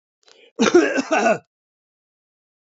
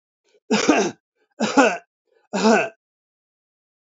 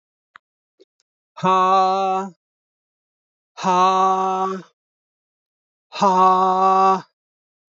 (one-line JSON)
{"cough_length": "2.6 s", "cough_amplitude": 27816, "cough_signal_mean_std_ratio": 0.4, "three_cough_length": "3.9 s", "three_cough_amplitude": 26209, "three_cough_signal_mean_std_ratio": 0.4, "exhalation_length": "7.8 s", "exhalation_amplitude": 21319, "exhalation_signal_mean_std_ratio": 0.51, "survey_phase": "beta (2021-08-13 to 2022-03-07)", "age": "65+", "gender": "Male", "wearing_mask": "No", "symptom_none": true, "smoker_status": "Ex-smoker", "respiratory_condition_asthma": false, "respiratory_condition_other": false, "recruitment_source": "REACT", "submission_delay": "1 day", "covid_test_result": "Negative", "covid_test_method": "RT-qPCR"}